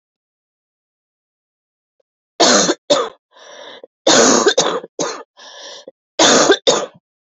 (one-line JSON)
{"three_cough_length": "7.3 s", "three_cough_amplitude": 32462, "three_cough_signal_mean_std_ratio": 0.43, "survey_phase": "beta (2021-08-13 to 2022-03-07)", "age": "18-44", "gender": "Female", "wearing_mask": "No", "symptom_cough_any": true, "symptom_new_continuous_cough": true, "symptom_runny_or_blocked_nose": true, "symptom_fatigue": true, "symptom_fever_high_temperature": true, "symptom_headache": true, "smoker_status": "Never smoked", "respiratory_condition_asthma": true, "respiratory_condition_other": false, "recruitment_source": "Test and Trace", "submission_delay": "2 days", "covid_test_result": "Positive", "covid_test_method": "ePCR"}